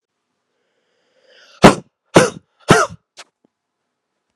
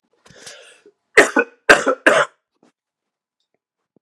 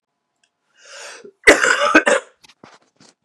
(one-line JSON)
{"exhalation_length": "4.4 s", "exhalation_amplitude": 32768, "exhalation_signal_mean_std_ratio": 0.23, "three_cough_length": "4.0 s", "three_cough_amplitude": 32768, "three_cough_signal_mean_std_ratio": 0.29, "cough_length": "3.2 s", "cough_amplitude": 32768, "cough_signal_mean_std_ratio": 0.34, "survey_phase": "beta (2021-08-13 to 2022-03-07)", "age": "18-44", "gender": "Male", "wearing_mask": "No", "symptom_cough_any": true, "symptom_runny_or_blocked_nose": true, "symptom_fatigue": true, "symptom_other": true, "symptom_onset": "6 days", "smoker_status": "Never smoked", "respiratory_condition_asthma": false, "respiratory_condition_other": false, "recruitment_source": "Test and Trace", "submission_delay": "2 days", "covid_test_result": "Positive", "covid_test_method": "RT-qPCR", "covid_ct_value": 24.2, "covid_ct_gene": "ORF1ab gene"}